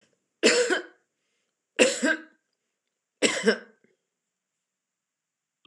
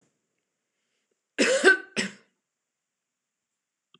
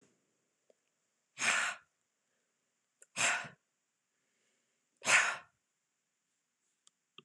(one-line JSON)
{"three_cough_length": "5.7 s", "three_cough_amplitude": 20580, "three_cough_signal_mean_std_ratio": 0.32, "cough_length": "4.0 s", "cough_amplitude": 19930, "cough_signal_mean_std_ratio": 0.26, "exhalation_length": "7.2 s", "exhalation_amplitude": 7988, "exhalation_signal_mean_std_ratio": 0.27, "survey_phase": "beta (2021-08-13 to 2022-03-07)", "age": "45-64", "gender": "Female", "wearing_mask": "No", "symptom_none": true, "smoker_status": "Never smoked", "respiratory_condition_asthma": false, "respiratory_condition_other": false, "recruitment_source": "REACT", "submission_delay": "3 days", "covid_test_result": "Negative", "covid_test_method": "RT-qPCR"}